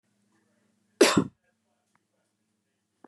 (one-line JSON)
{"cough_length": "3.1 s", "cough_amplitude": 15851, "cough_signal_mean_std_ratio": 0.2, "survey_phase": "beta (2021-08-13 to 2022-03-07)", "age": "18-44", "gender": "Female", "wearing_mask": "No", "symptom_none": true, "smoker_status": "Never smoked", "respiratory_condition_asthma": false, "respiratory_condition_other": false, "recruitment_source": "REACT", "submission_delay": "0 days", "covid_test_result": "Negative", "covid_test_method": "RT-qPCR", "influenza_a_test_result": "Negative", "influenza_b_test_result": "Negative"}